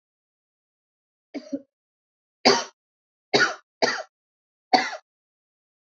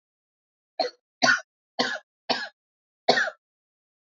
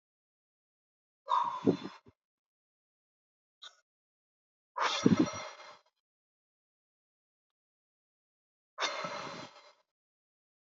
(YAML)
three_cough_length: 6.0 s
three_cough_amplitude: 25050
three_cough_signal_mean_std_ratio: 0.26
cough_length: 4.0 s
cough_amplitude: 20454
cough_signal_mean_std_ratio: 0.33
exhalation_length: 10.8 s
exhalation_amplitude: 12398
exhalation_signal_mean_std_ratio: 0.26
survey_phase: alpha (2021-03-01 to 2021-08-12)
age: 45-64
gender: Female
wearing_mask: 'No'
symptom_cough_any: true
symptom_fatigue: true
symptom_headache: true
symptom_onset: 6 days
smoker_status: Never smoked
respiratory_condition_asthma: false
respiratory_condition_other: false
recruitment_source: Test and Trace
submission_delay: 2 days
covid_test_result: Positive
covid_test_method: ePCR